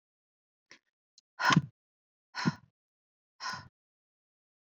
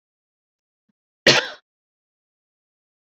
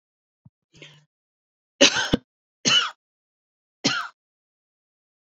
exhalation_length: 4.7 s
exhalation_amplitude: 11592
exhalation_signal_mean_std_ratio: 0.22
cough_length: 3.1 s
cough_amplitude: 31701
cough_signal_mean_std_ratio: 0.18
three_cough_length: 5.4 s
three_cough_amplitude: 27887
three_cough_signal_mean_std_ratio: 0.26
survey_phase: beta (2021-08-13 to 2022-03-07)
age: 18-44
gender: Female
wearing_mask: 'No'
symptom_cough_any: true
symptom_sore_throat: true
symptom_fatigue: true
symptom_headache: true
symptom_onset: 2 days
smoker_status: Ex-smoker
respiratory_condition_asthma: false
respiratory_condition_other: false
recruitment_source: Test and Trace
submission_delay: 0 days
covid_test_result: Positive
covid_test_method: RT-qPCR
covid_ct_value: 21.4
covid_ct_gene: ORF1ab gene
covid_ct_mean: 22.0
covid_viral_load: 62000 copies/ml
covid_viral_load_category: Low viral load (10K-1M copies/ml)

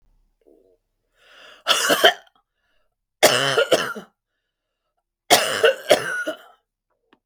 three_cough_length: 7.3 s
three_cough_amplitude: 32766
three_cough_signal_mean_std_ratio: 0.36
survey_phase: beta (2021-08-13 to 2022-03-07)
age: 65+
gender: Female
wearing_mask: 'No'
symptom_none: true
smoker_status: Never smoked
respiratory_condition_asthma: false
respiratory_condition_other: false
recruitment_source: Test and Trace
submission_delay: 2 days
covid_test_result: Negative
covid_test_method: RT-qPCR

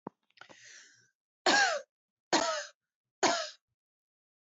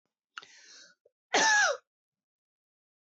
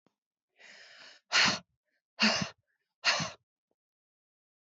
three_cough_length: 4.4 s
three_cough_amplitude: 9402
three_cough_signal_mean_std_ratio: 0.35
cough_length: 3.2 s
cough_amplitude: 7985
cough_signal_mean_std_ratio: 0.32
exhalation_length: 4.6 s
exhalation_amplitude: 7870
exhalation_signal_mean_std_ratio: 0.32
survey_phase: beta (2021-08-13 to 2022-03-07)
age: 18-44
gender: Female
wearing_mask: 'No'
symptom_runny_or_blocked_nose: true
smoker_status: Never smoked
respiratory_condition_asthma: true
respiratory_condition_other: false
recruitment_source: REACT
submission_delay: 1 day
covid_test_result: Negative
covid_test_method: RT-qPCR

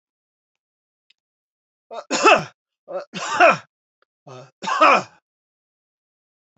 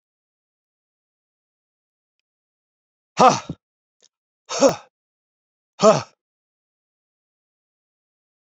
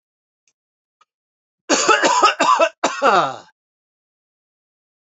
three_cough_length: 6.6 s
three_cough_amplitude: 29934
three_cough_signal_mean_std_ratio: 0.3
exhalation_length: 8.4 s
exhalation_amplitude: 28087
exhalation_signal_mean_std_ratio: 0.19
cough_length: 5.1 s
cough_amplitude: 26410
cough_signal_mean_std_ratio: 0.41
survey_phase: alpha (2021-03-01 to 2021-08-12)
age: 65+
gender: Male
wearing_mask: 'No'
symptom_none: true
smoker_status: Ex-smoker
respiratory_condition_asthma: false
respiratory_condition_other: false
recruitment_source: REACT
submission_delay: 1 day
covid_test_result: Negative
covid_test_method: RT-qPCR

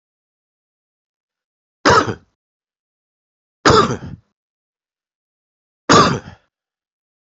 three_cough_length: 7.3 s
three_cough_amplitude: 30094
three_cough_signal_mean_std_ratio: 0.26
survey_phase: beta (2021-08-13 to 2022-03-07)
age: 45-64
gender: Male
wearing_mask: 'No'
symptom_cough_any: true
symptom_runny_or_blocked_nose: true
symptom_fatigue: true
symptom_fever_high_temperature: true
symptom_onset: 3 days
smoker_status: Never smoked
respiratory_condition_asthma: true
respiratory_condition_other: false
recruitment_source: Test and Trace
submission_delay: 1 day
covid_test_result: Positive
covid_test_method: RT-qPCR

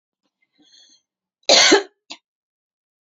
cough_length: 3.1 s
cough_amplitude: 30194
cough_signal_mean_std_ratio: 0.27
survey_phase: beta (2021-08-13 to 2022-03-07)
age: 45-64
gender: Female
wearing_mask: 'No'
symptom_diarrhoea: true
symptom_headache: true
smoker_status: Never smoked
respiratory_condition_asthma: false
respiratory_condition_other: false
recruitment_source: Test and Trace
submission_delay: 1 day
covid_test_result: Positive
covid_test_method: RT-qPCR
covid_ct_value: 30.2
covid_ct_gene: N gene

